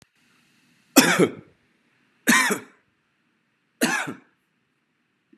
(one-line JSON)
{"three_cough_length": "5.4 s", "three_cough_amplitude": 31733, "three_cough_signal_mean_std_ratio": 0.3, "survey_phase": "beta (2021-08-13 to 2022-03-07)", "age": "18-44", "gender": "Male", "wearing_mask": "No", "symptom_none": true, "symptom_onset": "12 days", "smoker_status": "Never smoked", "respiratory_condition_asthma": false, "respiratory_condition_other": false, "recruitment_source": "REACT", "submission_delay": "1 day", "covid_test_result": "Negative", "covid_test_method": "RT-qPCR", "influenza_a_test_result": "Negative", "influenza_b_test_result": "Negative"}